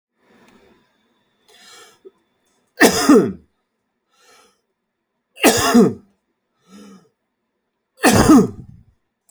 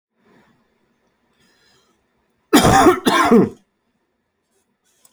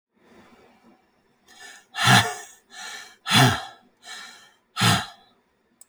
{"three_cough_length": "9.3 s", "three_cough_amplitude": 32767, "three_cough_signal_mean_std_ratio": 0.31, "cough_length": "5.1 s", "cough_amplitude": 30194, "cough_signal_mean_std_ratio": 0.34, "exhalation_length": "5.9 s", "exhalation_amplitude": 24522, "exhalation_signal_mean_std_ratio": 0.34, "survey_phase": "alpha (2021-03-01 to 2021-08-12)", "age": "18-44", "gender": "Male", "wearing_mask": "No", "symptom_cough_any": true, "symptom_fatigue": true, "symptom_fever_high_temperature": true, "symptom_headache": true, "symptom_onset": "4 days", "smoker_status": "Never smoked", "respiratory_condition_asthma": false, "respiratory_condition_other": false, "recruitment_source": "Test and Trace", "submission_delay": "1 day", "covid_test_result": "Positive", "covid_test_method": "RT-qPCR"}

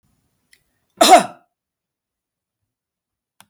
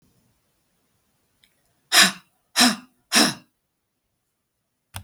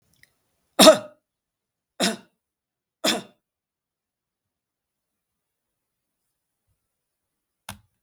{"cough_length": "3.5 s", "cough_amplitude": 32768, "cough_signal_mean_std_ratio": 0.2, "exhalation_length": "5.0 s", "exhalation_amplitude": 32768, "exhalation_signal_mean_std_ratio": 0.26, "three_cough_length": "8.0 s", "three_cough_amplitude": 32768, "three_cough_signal_mean_std_ratio": 0.16, "survey_phase": "beta (2021-08-13 to 2022-03-07)", "age": "65+", "gender": "Female", "wearing_mask": "No", "symptom_none": true, "smoker_status": "Never smoked", "respiratory_condition_asthma": false, "respiratory_condition_other": false, "recruitment_source": "REACT", "submission_delay": "4 days", "covid_test_result": "Negative", "covid_test_method": "RT-qPCR", "influenza_a_test_result": "Negative", "influenza_b_test_result": "Negative"}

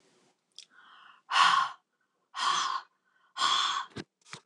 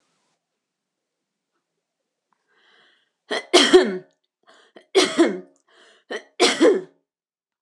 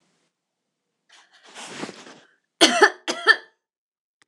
{"exhalation_length": "4.5 s", "exhalation_amplitude": 11226, "exhalation_signal_mean_std_ratio": 0.44, "three_cough_length": "7.6 s", "three_cough_amplitude": 26027, "three_cough_signal_mean_std_ratio": 0.31, "cough_length": "4.3 s", "cough_amplitude": 26028, "cough_signal_mean_std_ratio": 0.26, "survey_phase": "beta (2021-08-13 to 2022-03-07)", "age": "45-64", "gender": "Female", "wearing_mask": "No", "symptom_none": true, "smoker_status": "Ex-smoker", "respiratory_condition_asthma": false, "respiratory_condition_other": false, "recruitment_source": "REACT", "submission_delay": "2 days", "covid_test_result": "Negative", "covid_test_method": "RT-qPCR"}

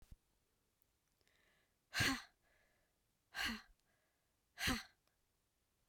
{"exhalation_length": "5.9 s", "exhalation_amplitude": 2108, "exhalation_signal_mean_std_ratio": 0.28, "survey_phase": "beta (2021-08-13 to 2022-03-07)", "age": "45-64", "gender": "Female", "wearing_mask": "No", "symptom_cough_any": true, "symptom_runny_or_blocked_nose": true, "symptom_sore_throat": true, "symptom_diarrhoea": true, "symptom_fatigue": true, "symptom_headache": true, "symptom_other": true, "smoker_status": "Current smoker (e-cigarettes or vapes only)", "respiratory_condition_asthma": false, "respiratory_condition_other": false, "recruitment_source": "Test and Trace", "submission_delay": "1 day", "covid_test_result": "Positive", "covid_test_method": "LFT"}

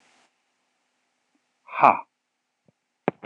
{"exhalation_length": "3.3 s", "exhalation_amplitude": 25991, "exhalation_signal_mean_std_ratio": 0.17, "survey_phase": "beta (2021-08-13 to 2022-03-07)", "age": "18-44", "gender": "Male", "wearing_mask": "No", "symptom_none": true, "symptom_onset": "6 days", "smoker_status": "Never smoked", "respiratory_condition_asthma": false, "respiratory_condition_other": false, "recruitment_source": "REACT", "submission_delay": "3 days", "covid_test_result": "Negative", "covid_test_method": "RT-qPCR", "influenza_a_test_result": "Negative", "influenza_b_test_result": "Negative"}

